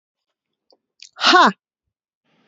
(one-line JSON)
{"exhalation_length": "2.5 s", "exhalation_amplitude": 28712, "exhalation_signal_mean_std_ratio": 0.28, "survey_phase": "beta (2021-08-13 to 2022-03-07)", "age": "18-44", "gender": "Female", "wearing_mask": "No", "symptom_cough_any": true, "symptom_runny_or_blocked_nose": true, "symptom_sore_throat": true, "symptom_abdominal_pain": true, "symptom_diarrhoea": true, "symptom_fatigue": true, "symptom_other": true, "smoker_status": "Never smoked", "respiratory_condition_asthma": false, "respiratory_condition_other": false, "recruitment_source": "REACT", "submission_delay": "4 days", "covid_test_result": "Negative", "covid_test_method": "RT-qPCR", "influenza_a_test_result": "Negative", "influenza_b_test_result": "Negative"}